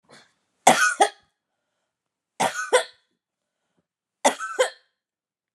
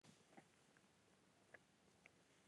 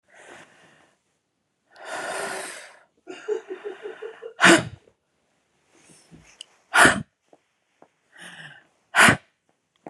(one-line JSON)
{"three_cough_length": "5.5 s", "three_cough_amplitude": 28951, "three_cough_signal_mean_std_ratio": 0.3, "cough_length": "2.5 s", "cough_amplitude": 178, "cough_signal_mean_std_ratio": 0.79, "exhalation_length": "9.9 s", "exhalation_amplitude": 30353, "exhalation_signal_mean_std_ratio": 0.27, "survey_phase": "beta (2021-08-13 to 2022-03-07)", "age": "45-64", "gender": "Female", "wearing_mask": "No", "symptom_none": true, "smoker_status": "Ex-smoker", "respiratory_condition_asthma": false, "respiratory_condition_other": false, "recruitment_source": "Test and Trace", "submission_delay": "2 days", "covid_test_result": "Negative", "covid_test_method": "RT-qPCR"}